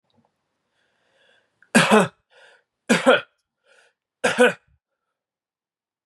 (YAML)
three_cough_length: 6.1 s
three_cough_amplitude: 27165
three_cough_signal_mean_std_ratio: 0.28
survey_phase: beta (2021-08-13 to 2022-03-07)
age: 18-44
gender: Male
wearing_mask: 'No'
symptom_fatigue: true
smoker_status: Never smoked
respiratory_condition_asthma: false
respiratory_condition_other: false
recruitment_source: REACT
submission_delay: 3 days
covid_test_result: Negative
covid_test_method: RT-qPCR
influenza_a_test_result: Negative
influenza_b_test_result: Negative